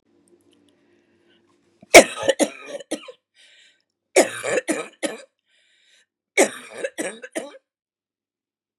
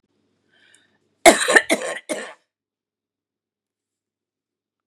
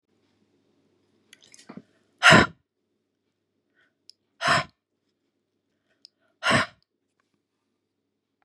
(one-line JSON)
{"three_cough_length": "8.8 s", "three_cough_amplitude": 32768, "three_cough_signal_mean_std_ratio": 0.23, "cough_length": "4.9 s", "cough_amplitude": 32768, "cough_signal_mean_std_ratio": 0.22, "exhalation_length": "8.4 s", "exhalation_amplitude": 27991, "exhalation_signal_mean_std_ratio": 0.2, "survey_phase": "beta (2021-08-13 to 2022-03-07)", "age": "45-64", "gender": "Female", "wearing_mask": "No", "symptom_none": true, "symptom_onset": "6 days", "smoker_status": "Never smoked", "respiratory_condition_asthma": false, "respiratory_condition_other": false, "recruitment_source": "REACT", "submission_delay": "6 days", "covid_test_result": "Negative", "covid_test_method": "RT-qPCR", "influenza_a_test_result": "Unknown/Void", "influenza_b_test_result": "Unknown/Void"}